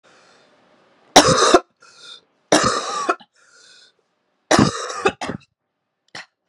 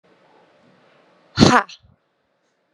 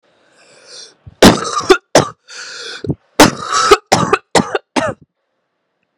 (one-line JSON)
{"three_cough_length": "6.5 s", "three_cough_amplitude": 32768, "three_cough_signal_mean_std_ratio": 0.35, "exhalation_length": "2.7 s", "exhalation_amplitude": 32768, "exhalation_signal_mean_std_ratio": 0.22, "cough_length": "6.0 s", "cough_amplitude": 32768, "cough_signal_mean_std_ratio": 0.39, "survey_phase": "beta (2021-08-13 to 2022-03-07)", "age": "18-44", "gender": "Female", "wearing_mask": "No", "symptom_cough_any": true, "symptom_new_continuous_cough": true, "symptom_runny_or_blocked_nose": true, "symptom_sore_throat": true, "symptom_fatigue": true, "symptom_headache": true, "symptom_change_to_sense_of_smell_or_taste": true, "symptom_loss_of_taste": true, "symptom_onset": "4 days", "smoker_status": "Never smoked", "respiratory_condition_asthma": true, "respiratory_condition_other": false, "recruitment_source": "Test and Trace", "submission_delay": "1 day", "covid_test_result": "Positive", "covid_test_method": "RT-qPCR"}